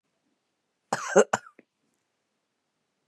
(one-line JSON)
{"cough_length": "3.1 s", "cough_amplitude": 21881, "cough_signal_mean_std_ratio": 0.19, "survey_phase": "beta (2021-08-13 to 2022-03-07)", "age": "45-64", "gender": "Female", "wearing_mask": "No", "symptom_none": true, "smoker_status": "Current smoker (11 or more cigarettes per day)", "respiratory_condition_asthma": false, "respiratory_condition_other": false, "recruitment_source": "REACT", "submission_delay": "4 days", "covid_test_result": "Negative", "covid_test_method": "RT-qPCR", "influenza_a_test_result": "Negative", "influenza_b_test_result": "Negative"}